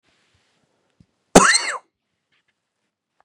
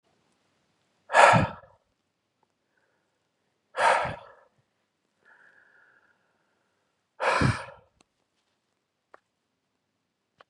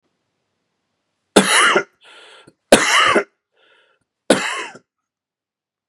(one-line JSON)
{"cough_length": "3.2 s", "cough_amplitude": 32768, "cough_signal_mean_std_ratio": 0.23, "exhalation_length": "10.5 s", "exhalation_amplitude": 24310, "exhalation_signal_mean_std_ratio": 0.24, "three_cough_length": "5.9 s", "three_cough_amplitude": 32768, "three_cough_signal_mean_std_ratio": 0.35, "survey_phase": "beta (2021-08-13 to 2022-03-07)", "age": "18-44", "gender": "Male", "wearing_mask": "No", "symptom_cough_any": true, "symptom_runny_or_blocked_nose": true, "symptom_sore_throat": true, "symptom_headache": true, "smoker_status": "Never smoked", "respiratory_condition_asthma": false, "respiratory_condition_other": false, "recruitment_source": "Test and Trace", "submission_delay": "3 days", "covid_test_result": "Positive", "covid_test_method": "ePCR"}